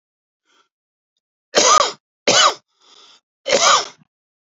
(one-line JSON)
{"three_cough_length": "4.5 s", "three_cough_amplitude": 32768, "three_cough_signal_mean_std_ratio": 0.37, "survey_phase": "beta (2021-08-13 to 2022-03-07)", "age": "18-44", "gender": "Male", "wearing_mask": "No", "symptom_none": true, "smoker_status": "Never smoked", "respiratory_condition_asthma": false, "respiratory_condition_other": false, "recruitment_source": "REACT", "submission_delay": "2 days", "covid_test_result": "Negative", "covid_test_method": "RT-qPCR", "influenza_a_test_result": "Negative", "influenza_b_test_result": "Negative"}